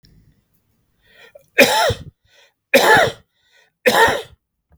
{
  "three_cough_length": "4.8 s",
  "three_cough_amplitude": 32768,
  "three_cough_signal_mean_std_ratio": 0.39,
  "survey_phase": "beta (2021-08-13 to 2022-03-07)",
  "age": "18-44",
  "gender": "Male",
  "wearing_mask": "No",
  "symptom_none": true,
  "symptom_onset": "3 days",
  "smoker_status": "Never smoked",
  "respiratory_condition_asthma": false,
  "respiratory_condition_other": false,
  "recruitment_source": "REACT",
  "submission_delay": "1 day",
  "covid_test_result": "Negative",
  "covid_test_method": "RT-qPCR",
  "influenza_a_test_result": "Unknown/Void",
  "influenza_b_test_result": "Unknown/Void"
}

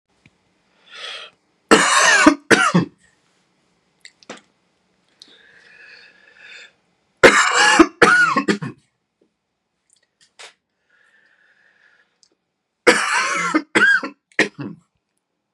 {
  "three_cough_length": "15.5 s",
  "three_cough_amplitude": 32768,
  "three_cough_signal_mean_std_ratio": 0.36,
  "survey_phase": "beta (2021-08-13 to 2022-03-07)",
  "age": "18-44",
  "gender": "Male",
  "wearing_mask": "No",
  "symptom_fatigue": true,
  "symptom_headache": true,
  "smoker_status": "Never smoked",
  "respiratory_condition_asthma": false,
  "respiratory_condition_other": false,
  "recruitment_source": "REACT",
  "submission_delay": "2 days",
  "covid_test_result": "Negative",
  "covid_test_method": "RT-qPCR",
  "influenza_a_test_result": "Negative",
  "influenza_b_test_result": "Negative"
}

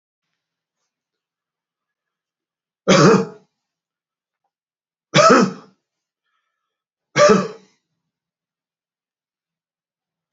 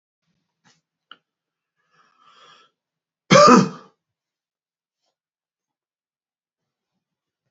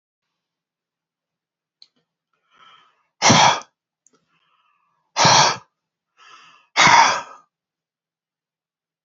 {
  "three_cough_length": "10.3 s",
  "three_cough_amplitude": 32426,
  "three_cough_signal_mean_std_ratio": 0.25,
  "cough_length": "7.5 s",
  "cough_amplitude": 29575,
  "cough_signal_mean_std_ratio": 0.18,
  "exhalation_length": "9.0 s",
  "exhalation_amplitude": 30783,
  "exhalation_signal_mean_std_ratio": 0.29,
  "survey_phase": "alpha (2021-03-01 to 2021-08-12)",
  "age": "65+",
  "gender": "Male",
  "wearing_mask": "No",
  "symptom_none": true,
  "smoker_status": "Never smoked",
  "respiratory_condition_asthma": false,
  "respiratory_condition_other": false,
  "recruitment_source": "REACT",
  "submission_delay": "2 days",
  "covid_test_result": "Negative",
  "covid_test_method": "RT-qPCR"
}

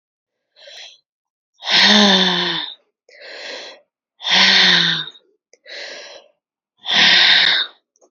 {
  "exhalation_length": "8.1 s",
  "exhalation_amplitude": 31287,
  "exhalation_signal_mean_std_ratio": 0.5,
  "survey_phase": "beta (2021-08-13 to 2022-03-07)",
  "age": "18-44",
  "gender": "Female",
  "wearing_mask": "No",
  "symptom_runny_or_blocked_nose": true,
  "symptom_diarrhoea": true,
  "symptom_fatigue": true,
  "symptom_fever_high_temperature": true,
  "symptom_headache": true,
  "symptom_onset": "2 days",
  "smoker_status": "Current smoker (e-cigarettes or vapes only)",
  "respiratory_condition_asthma": false,
  "respiratory_condition_other": false,
  "recruitment_source": "Test and Trace",
  "submission_delay": "1 day",
  "covid_test_result": "Positive",
  "covid_test_method": "RT-qPCR",
  "covid_ct_value": 13.5,
  "covid_ct_gene": "ORF1ab gene",
  "covid_ct_mean": 14.2,
  "covid_viral_load": "23000000 copies/ml",
  "covid_viral_load_category": "High viral load (>1M copies/ml)"
}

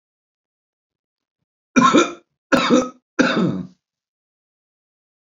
{
  "three_cough_length": "5.2 s",
  "three_cough_amplitude": 30767,
  "three_cough_signal_mean_std_ratio": 0.36,
  "survey_phase": "beta (2021-08-13 to 2022-03-07)",
  "age": "45-64",
  "gender": "Male",
  "wearing_mask": "No",
  "symptom_none": true,
  "smoker_status": "Current smoker (e-cigarettes or vapes only)",
  "respiratory_condition_asthma": false,
  "respiratory_condition_other": false,
  "recruitment_source": "REACT",
  "submission_delay": "1 day",
  "covid_test_result": "Negative",
  "covid_test_method": "RT-qPCR",
  "influenza_a_test_result": "Negative",
  "influenza_b_test_result": "Negative"
}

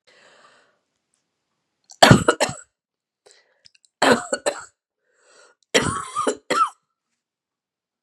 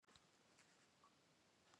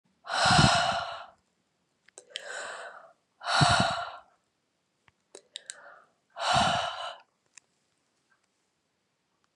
{
  "three_cough_length": "8.0 s",
  "three_cough_amplitude": 32768,
  "three_cough_signal_mean_std_ratio": 0.28,
  "cough_length": "1.8 s",
  "cough_amplitude": 108,
  "cough_signal_mean_std_ratio": 1.0,
  "exhalation_length": "9.6 s",
  "exhalation_amplitude": 14721,
  "exhalation_signal_mean_std_ratio": 0.39,
  "survey_phase": "beta (2021-08-13 to 2022-03-07)",
  "age": "65+",
  "gender": "Female",
  "wearing_mask": "No",
  "symptom_runny_or_blocked_nose": true,
  "smoker_status": "Never smoked",
  "respiratory_condition_asthma": false,
  "respiratory_condition_other": false,
  "recruitment_source": "Test and Trace",
  "submission_delay": "2 days",
  "covid_test_result": "Positive",
  "covid_test_method": "RT-qPCR",
  "covid_ct_value": 23.0,
  "covid_ct_gene": "N gene",
  "covid_ct_mean": 23.3,
  "covid_viral_load": "23000 copies/ml",
  "covid_viral_load_category": "Low viral load (10K-1M copies/ml)"
}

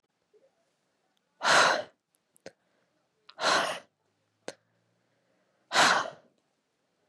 {
  "exhalation_length": "7.1 s",
  "exhalation_amplitude": 14540,
  "exhalation_signal_mean_std_ratio": 0.31,
  "survey_phase": "beta (2021-08-13 to 2022-03-07)",
  "age": "18-44",
  "gender": "Female",
  "wearing_mask": "Yes",
  "symptom_cough_any": true,
  "symptom_runny_or_blocked_nose": true,
  "symptom_fatigue": true,
  "symptom_headache": true,
  "symptom_change_to_sense_of_smell_or_taste": true,
  "symptom_other": true,
  "symptom_onset": "3 days",
  "smoker_status": "Never smoked",
  "respiratory_condition_asthma": true,
  "respiratory_condition_other": false,
  "recruitment_source": "Test and Trace",
  "submission_delay": "1 day",
  "covid_test_result": "Positive",
  "covid_test_method": "RT-qPCR",
  "covid_ct_value": 18.3,
  "covid_ct_gene": "N gene",
  "covid_ct_mean": 18.3,
  "covid_viral_load": "970000 copies/ml",
  "covid_viral_load_category": "Low viral load (10K-1M copies/ml)"
}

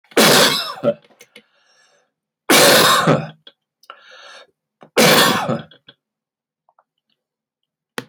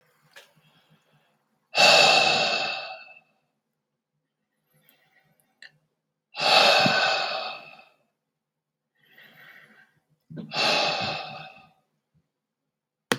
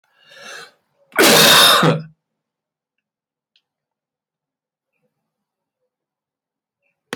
{
  "three_cough_length": "8.1 s",
  "three_cough_amplitude": 32768,
  "three_cough_signal_mean_std_ratio": 0.41,
  "exhalation_length": "13.2 s",
  "exhalation_amplitude": 23400,
  "exhalation_signal_mean_std_ratio": 0.37,
  "cough_length": "7.2 s",
  "cough_amplitude": 32767,
  "cough_signal_mean_std_ratio": 0.29,
  "survey_phase": "beta (2021-08-13 to 2022-03-07)",
  "age": "45-64",
  "gender": "Male",
  "wearing_mask": "No",
  "symptom_none": true,
  "smoker_status": "Ex-smoker",
  "respiratory_condition_asthma": false,
  "respiratory_condition_other": false,
  "recruitment_source": "REACT",
  "submission_delay": "2 days",
  "covid_test_result": "Negative",
  "covid_test_method": "RT-qPCR"
}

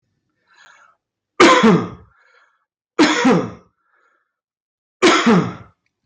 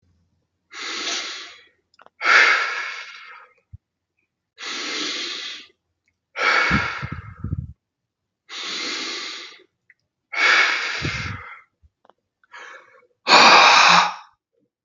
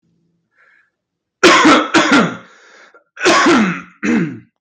{
  "three_cough_length": "6.1 s",
  "three_cough_amplitude": 32768,
  "three_cough_signal_mean_std_ratio": 0.41,
  "exhalation_length": "14.8 s",
  "exhalation_amplitude": 32768,
  "exhalation_signal_mean_std_ratio": 0.42,
  "cough_length": "4.6 s",
  "cough_amplitude": 32768,
  "cough_signal_mean_std_ratio": 0.56,
  "survey_phase": "beta (2021-08-13 to 2022-03-07)",
  "age": "18-44",
  "gender": "Male",
  "wearing_mask": "No",
  "symptom_cough_any": true,
  "symptom_fatigue": true,
  "symptom_loss_of_taste": true,
  "symptom_onset": "3 days",
  "smoker_status": "Ex-smoker",
  "respiratory_condition_asthma": false,
  "respiratory_condition_other": false,
  "recruitment_source": "Test and Trace",
  "submission_delay": "2 days",
  "covid_test_result": "Positive",
  "covid_test_method": "RT-qPCR"
}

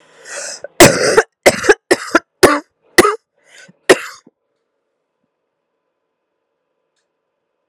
{
  "cough_length": "7.7 s",
  "cough_amplitude": 32768,
  "cough_signal_mean_std_ratio": 0.3,
  "survey_phase": "beta (2021-08-13 to 2022-03-07)",
  "age": "18-44",
  "gender": "Female",
  "wearing_mask": "No",
  "symptom_cough_any": true,
  "symptom_runny_or_blocked_nose": true,
  "symptom_shortness_of_breath": true,
  "symptom_fatigue": true,
  "symptom_headache": true,
  "symptom_change_to_sense_of_smell_or_taste": true,
  "symptom_loss_of_taste": true,
  "symptom_other": true,
  "symptom_onset": "5 days",
  "smoker_status": "Never smoked",
  "respiratory_condition_asthma": false,
  "respiratory_condition_other": false,
  "recruitment_source": "Test and Trace",
  "submission_delay": "2 days",
  "covid_test_result": "Positive",
  "covid_test_method": "RT-qPCR",
  "covid_ct_value": 19.2,
  "covid_ct_gene": "ORF1ab gene",
  "covid_ct_mean": 19.3,
  "covid_viral_load": "480000 copies/ml",
  "covid_viral_load_category": "Low viral load (10K-1M copies/ml)"
}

